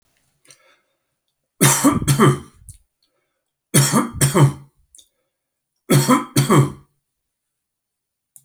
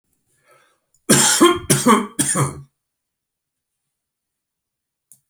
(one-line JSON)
{"three_cough_length": "8.4 s", "three_cough_amplitude": 32767, "three_cough_signal_mean_std_ratio": 0.39, "cough_length": "5.3 s", "cough_amplitude": 32768, "cough_signal_mean_std_ratio": 0.36, "survey_phase": "beta (2021-08-13 to 2022-03-07)", "age": "65+", "gender": "Male", "wearing_mask": "No", "symptom_none": true, "smoker_status": "Ex-smoker", "respiratory_condition_asthma": false, "respiratory_condition_other": false, "recruitment_source": "REACT", "submission_delay": "3 days", "covid_test_result": "Negative", "covid_test_method": "RT-qPCR"}